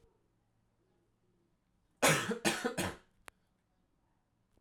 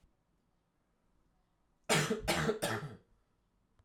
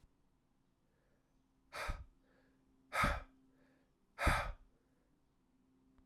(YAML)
cough_length: 4.6 s
cough_amplitude: 6161
cough_signal_mean_std_ratio: 0.3
three_cough_length: 3.8 s
three_cough_amplitude: 5104
three_cough_signal_mean_std_ratio: 0.39
exhalation_length: 6.1 s
exhalation_amplitude: 3817
exhalation_signal_mean_std_ratio: 0.3
survey_phase: alpha (2021-03-01 to 2021-08-12)
age: 18-44
gender: Male
wearing_mask: 'No'
symptom_cough_any: true
symptom_fatigue: true
symptom_headache: true
symptom_change_to_sense_of_smell_or_taste: true
symptom_loss_of_taste: true
symptom_onset: 4 days
smoker_status: Never smoked
respiratory_condition_asthma: false
respiratory_condition_other: false
recruitment_source: Test and Trace
submission_delay: 2 days
covid_test_result: Positive
covid_test_method: RT-qPCR
covid_ct_value: 15.1
covid_ct_gene: ORF1ab gene
covid_ct_mean: 16.3
covid_viral_load: 4500000 copies/ml
covid_viral_load_category: High viral load (>1M copies/ml)